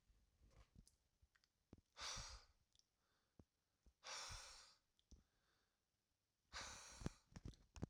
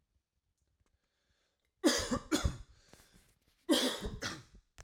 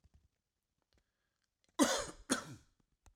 {
  "exhalation_length": "7.9 s",
  "exhalation_amplitude": 1215,
  "exhalation_signal_mean_std_ratio": 0.41,
  "cough_length": "4.8 s",
  "cough_amplitude": 5359,
  "cough_signal_mean_std_ratio": 0.37,
  "three_cough_length": "3.2 s",
  "three_cough_amplitude": 6298,
  "three_cough_signal_mean_std_ratio": 0.27,
  "survey_phase": "beta (2021-08-13 to 2022-03-07)",
  "age": "45-64",
  "gender": "Male",
  "wearing_mask": "No",
  "symptom_runny_or_blocked_nose": true,
  "smoker_status": "Never smoked",
  "recruitment_source": "REACT",
  "submission_delay": "1 day",
  "covid_test_result": "Negative",
  "covid_test_method": "RT-qPCR"
}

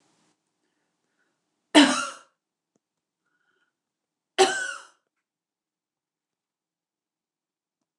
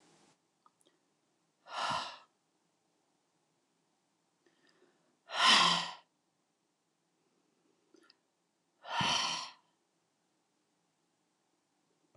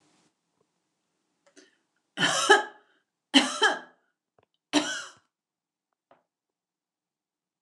{
  "cough_length": "8.0 s",
  "cough_amplitude": 25412,
  "cough_signal_mean_std_ratio": 0.19,
  "exhalation_length": "12.2 s",
  "exhalation_amplitude": 7217,
  "exhalation_signal_mean_std_ratio": 0.26,
  "three_cough_length": "7.6 s",
  "three_cough_amplitude": 22139,
  "three_cough_signal_mean_std_ratio": 0.26,
  "survey_phase": "beta (2021-08-13 to 2022-03-07)",
  "age": "65+",
  "gender": "Female",
  "wearing_mask": "No",
  "symptom_other": true,
  "smoker_status": "Never smoked",
  "respiratory_condition_asthma": false,
  "respiratory_condition_other": false,
  "recruitment_source": "Test and Trace",
  "submission_delay": "1 day",
  "covid_test_result": "Positive",
  "covid_test_method": "RT-qPCR",
  "covid_ct_value": 18.9,
  "covid_ct_gene": "N gene"
}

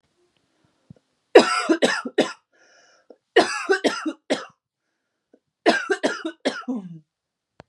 {
  "three_cough_length": "7.7 s",
  "three_cough_amplitude": 32768,
  "three_cough_signal_mean_std_ratio": 0.35,
  "survey_phase": "beta (2021-08-13 to 2022-03-07)",
  "age": "18-44",
  "gender": "Female",
  "wearing_mask": "No",
  "symptom_runny_or_blocked_nose": true,
  "symptom_fatigue": true,
  "symptom_headache": true,
  "symptom_onset": "12 days",
  "smoker_status": "Ex-smoker",
  "respiratory_condition_asthma": false,
  "respiratory_condition_other": false,
  "recruitment_source": "REACT",
  "submission_delay": "1 day",
  "covid_test_result": "Negative",
  "covid_test_method": "RT-qPCR",
  "influenza_a_test_result": "Negative",
  "influenza_b_test_result": "Negative"
}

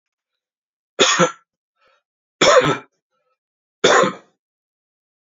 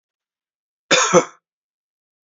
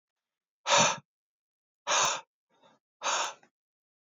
{
  "three_cough_length": "5.4 s",
  "three_cough_amplitude": 29172,
  "three_cough_signal_mean_std_ratio": 0.33,
  "cough_length": "2.3 s",
  "cough_amplitude": 29747,
  "cough_signal_mean_std_ratio": 0.28,
  "exhalation_length": "4.0 s",
  "exhalation_amplitude": 9607,
  "exhalation_signal_mean_std_ratio": 0.36,
  "survey_phase": "beta (2021-08-13 to 2022-03-07)",
  "age": "18-44",
  "gender": "Male",
  "wearing_mask": "No",
  "symptom_runny_or_blocked_nose": true,
  "symptom_fatigue": true,
  "symptom_other": true,
  "smoker_status": "Never smoked",
  "respiratory_condition_asthma": false,
  "respiratory_condition_other": false,
  "recruitment_source": "Test and Trace",
  "submission_delay": "2 days",
  "covid_test_result": "Positive",
  "covid_test_method": "RT-qPCR",
  "covid_ct_value": 29.1,
  "covid_ct_gene": "ORF1ab gene",
  "covid_ct_mean": 29.5,
  "covid_viral_load": "200 copies/ml",
  "covid_viral_load_category": "Minimal viral load (< 10K copies/ml)"
}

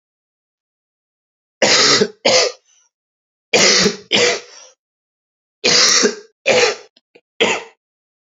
{
  "three_cough_length": "8.4 s",
  "three_cough_amplitude": 32768,
  "three_cough_signal_mean_std_ratio": 0.45,
  "survey_phase": "beta (2021-08-13 to 2022-03-07)",
  "age": "18-44",
  "gender": "Male",
  "wearing_mask": "No",
  "symptom_cough_any": true,
  "symptom_runny_or_blocked_nose": true,
  "symptom_sore_throat": true,
  "symptom_abdominal_pain": true,
  "symptom_fatigue": true,
  "symptom_change_to_sense_of_smell_or_taste": true,
  "smoker_status": "Never smoked",
  "respiratory_condition_asthma": true,
  "respiratory_condition_other": false,
  "recruitment_source": "Test and Trace",
  "submission_delay": "2 days",
  "covid_test_result": "Positive",
  "covid_test_method": "LFT"
}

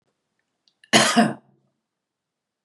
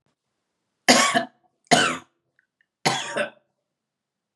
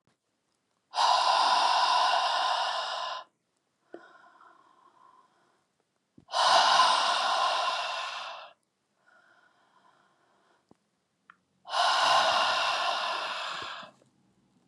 {
  "cough_length": "2.6 s",
  "cough_amplitude": 29527,
  "cough_signal_mean_std_ratio": 0.29,
  "three_cough_length": "4.4 s",
  "three_cough_amplitude": 30112,
  "three_cough_signal_mean_std_ratio": 0.34,
  "exhalation_length": "14.7 s",
  "exhalation_amplitude": 11543,
  "exhalation_signal_mean_std_ratio": 0.55,
  "survey_phase": "beta (2021-08-13 to 2022-03-07)",
  "age": "45-64",
  "gender": "Female",
  "wearing_mask": "No",
  "symptom_fatigue": true,
  "smoker_status": "Ex-smoker",
  "respiratory_condition_asthma": false,
  "respiratory_condition_other": false,
  "recruitment_source": "REACT",
  "submission_delay": "2 days",
  "covid_test_result": "Negative",
  "covid_test_method": "RT-qPCR",
  "influenza_a_test_result": "Negative",
  "influenza_b_test_result": "Negative"
}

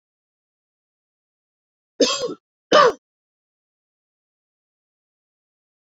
{
  "cough_length": "6.0 s",
  "cough_amplitude": 30555,
  "cough_signal_mean_std_ratio": 0.2,
  "survey_phase": "beta (2021-08-13 to 2022-03-07)",
  "age": "18-44",
  "gender": "Female",
  "wearing_mask": "No",
  "symptom_shortness_of_breath": true,
  "symptom_sore_throat": true,
  "symptom_diarrhoea": true,
  "symptom_fatigue": true,
  "smoker_status": "Never smoked",
  "respiratory_condition_asthma": false,
  "respiratory_condition_other": false,
  "recruitment_source": "Test and Trace",
  "submission_delay": "1 day",
  "covid_test_result": "Positive",
  "covid_test_method": "RT-qPCR",
  "covid_ct_value": 29.8,
  "covid_ct_gene": "ORF1ab gene",
  "covid_ct_mean": 30.7,
  "covid_viral_load": "84 copies/ml",
  "covid_viral_load_category": "Minimal viral load (< 10K copies/ml)"
}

